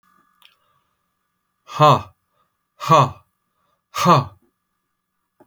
{
  "exhalation_length": "5.5 s",
  "exhalation_amplitude": 29350,
  "exhalation_signal_mean_std_ratio": 0.29,
  "survey_phase": "alpha (2021-03-01 to 2021-08-12)",
  "age": "45-64",
  "gender": "Male",
  "wearing_mask": "No",
  "symptom_none": true,
  "smoker_status": "Never smoked",
  "respiratory_condition_asthma": false,
  "respiratory_condition_other": false,
  "recruitment_source": "REACT",
  "submission_delay": "2 days",
  "covid_test_result": "Negative",
  "covid_test_method": "RT-qPCR"
}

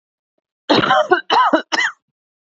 {
  "three_cough_length": "2.5 s",
  "three_cough_amplitude": 27707,
  "three_cough_signal_mean_std_ratio": 0.52,
  "survey_phase": "beta (2021-08-13 to 2022-03-07)",
  "age": "18-44",
  "gender": "Female",
  "wearing_mask": "No",
  "symptom_runny_or_blocked_nose": true,
  "symptom_headache": true,
  "symptom_onset": "3 days",
  "smoker_status": "Never smoked",
  "respiratory_condition_asthma": false,
  "respiratory_condition_other": false,
  "recruitment_source": "REACT",
  "submission_delay": "1 day",
  "covid_test_result": "Negative",
  "covid_test_method": "RT-qPCR",
  "influenza_a_test_result": "Negative",
  "influenza_b_test_result": "Negative"
}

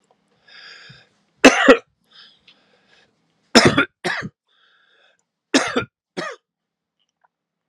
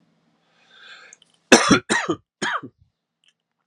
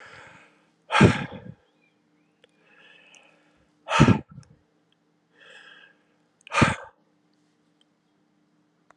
{
  "three_cough_length": "7.7 s",
  "three_cough_amplitude": 32768,
  "three_cough_signal_mean_std_ratio": 0.26,
  "cough_length": "3.7 s",
  "cough_amplitude": 32768,
  "cough_signal_mean_std_ratio": 0.29,
  "exhalation_length": "9.0 s",
  "exhalation_amplitude": 26388,
  "exhalation_signal_mean_std_ratio": 0.23,
  "survey_phase": "alpha (2021-03-01 to 2021-08-12)",
  "age": "45-64",
  "gender": "Male",
  "wearing_mask": "No",
  "symptom_new_continuous_cough": true,
  "symptom_fatigue": true,
  "symptom_fever_high_temperature": true,
  "symptom_headache": true,
  "symptom_onset": "3 days",
  "smoker_status": "Never smoked",
  "respiratory_condition_asthma": false,
  "respiratory_condition_other": false,
  "recruitment_source": "Test and Trace",
  "submission_delay": "2 days",
  "covid_test_result": "Positive",
  "covid_test_method": "RT-qPCR",
  "covid_ct_value": 17.0,
  "covid_ct_gene": "ORF1ab gene",
  "covid_ct_mean": 17.7,
  "covid_viral_load": "1600000 copies/ml",
  "covid_viral_load_category": "High viral load (>1M copies/ml)"
}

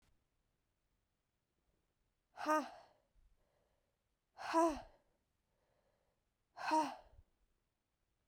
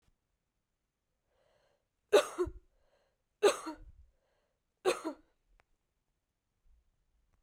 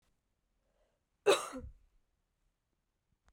{
  "exhalation_length": "8.3 s",
  "exhalation_amplitude": 2618,
  "exhalation_signal_mean_std_ratio": 0.27,
  "three_cough_length": "7.4 s",
  "three_cough_amplitude": 6713,
  "three_cough_signal_mean_std_ratio": 0.21,
  "cough_length": "3.3 s",
  "cough_amplitude": 5680,
  "cough_signal_mean_std_ratio": 0.2,
  "survey_phase": "beta (2021-08-13 to 2022-03-07)",
  "age": "45-64",
  "gender": "Female",
  "wearing_mask": "No",
  "symptom_runny_or_blocked_nose": true,
  "smoker_status": "Ex-smoker",
  "respiratory_condition_asthma": false,
  "respiratory_condition_other": false,
  "recruitment_source": "Test and Trace",
  "submission_delay": "2 days",
  "covid_test_result": "Positive",
  "covid_test_method": "RT-qPCR",
  "covid_ct_value": 24.8,
  "covid_ct_gene": "ORF1ab gene",
  "covid_ct_mean": 25.4,
  "covid_viral_load": "4800 copies/ml",
  "covid_viral_load_category": "Minimal viral load (< 10K copies/ml)"
}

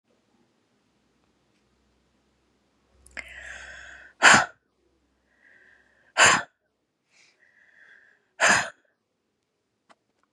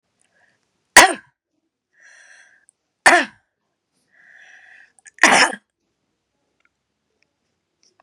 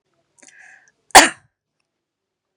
{
  "exhalation_length": "10.3 s",
  "exhalation_amplitude": 31066,
  "exhalation_signal_mean_std_ratio": 0.22,
  "three_cough_length": "8.0 s",
  "three_cough_amplitude": 32768,
  "three_cough_signal_mean_std_ratio": 0.21,
  "cough_length": "2.6 s",
  "cough_amplitude": 32768,
  "cough_signal_mean_std_ratio": 0.18,
  "survey_phase": "beta (2021-08-13 to 2022-03-07)",
  "age": "65+",
  "gender": "Female",
  "wearing_mask": "No",
  "symptom_none": true,
  "smoker_status": "Never smoked",
  "respiratory_condition_asthma": false,
  "respiratory_condition_other": false,
  "recruitment_source": "Test and Trace",
  "submission_delay": "3 days",
  "covid_test_result": "Negative",
  "covid_test_method": "RT-qPCR"
}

